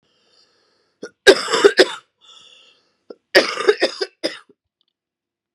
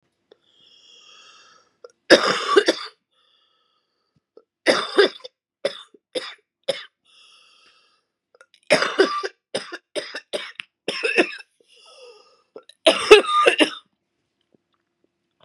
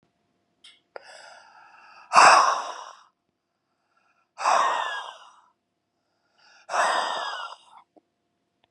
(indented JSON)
{
  "cough_length": "5.5 s",
  "cough_amplitude": 32768,
  "cough_signal_mean_std_ratio": 0.29,
  "three_cough_length": "15.4 s",
  "three_cough_amplitude": 32768,
  "three_cough_signal_mean_std_ratio": 0.3,
  "exhalation_length": "8.7 s",
  "exhalation_amplitude": 28773,
  "exhalation_signal_mean_std_ratio": 0.33,
  "survey_phase": "beta (2021-08-13 to 2022-03-07)",
  "age": "45-64",
  "gender": "Female",
  "wearing_mask": "No",
  "symptom_cough_any": true,
  "symptom_runny_or_blocked_nose": true,
  "symptom_shortness_of_breath": true,
  "symptom_onset": "4 days",
  "smoker_status": "Never smoked",
  "respiratory_condition_asthma": true,
  "respiratory_condition_other": false,
  "recruitment_source": "Test and Trace",
  "submission_delay": "1 day",
  "covid_test_result": "Positive",
  "covid_test_method": "RT-qPCR",
  "covid_ct_value": 20.7,
  "covid_ct_gene": "ORF1ab gene"
}